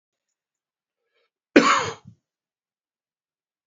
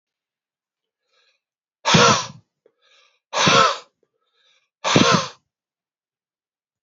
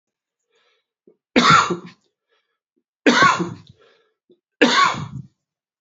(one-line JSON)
{"cough_length": "3.7 s", "cough_amplitude": 27407, "cough_signal_mean_std_ratio": 0.21, "exhalation_length": "6.8 s", "exhalation_amplitude": 27752, "exhalation_signal_mean_std_ratio": 0.33, "three_cough_length": "5.8 s", "three_cough_amplitude": 28887, "three_cough_signal_mean_std_ratio": 0.36, "survey_phase": "beta (2021-08-13 to 2022-03-07)", "age": "45-64", "gender": "Male", "wearing_mask": "No", "symptom_cough_any": true, "symptom_new_continuous_cough": true, "symptom_runny_or_blocked_nose": true, "symptom_shortness_of_breath": true, "symptom_fatigue": true, "symptom_fever_high_temperature": true, "symptom_headache": true, "symptom_change_to_sense_of_smell_or_taste": true, "symptom_loss_of_taste": true, "symptom_onset": "7 days", "smoker_status": "Ex-smoker", "respiratory_condition_asthma": false, "respiratory_condition_other": false, "recruitment_source": "Test and Trace", "submission_delay": "2 days", "covid_test_result": "Positive", "covid_test_method": "RT-qPCR"}